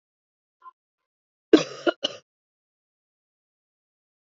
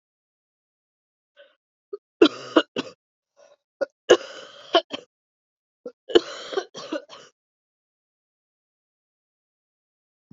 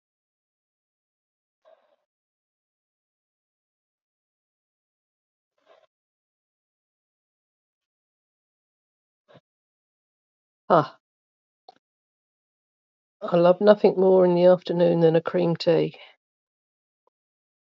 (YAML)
cough_length: 4.4 s
cough_amplitude: 27293
cough_signal_mean_std_ratio: 0.14
three_cough_length: 10.3 s
three_cough_amplitude: 29863
three_cough_signal_mean_std_ratio: 0.19
exhalation_length: 17.7 s
exhalation_amplitude: 23653
exhalation_signal_mean_std_ratio: 0.28
survey_phase: beta (2021-08-13 to 2022-03-07)
age: 45-64
gender: Female
wearing_mask: 'No'
symptom_cough_any: true
symptom_runny_or_blocked_nose: true
symptom_shortness_of_breath: true
symptom_fatigue: true
symptom_headache: true
symptom_onset: 2 days
smoker_status: Never smoked
respiratory_condition_asthma: false
respiratory_condition_other: false
recruitment_source: Test and Trace
submission_delay: 1 day
covid_test_result: Positive
covid_test_method: ePCR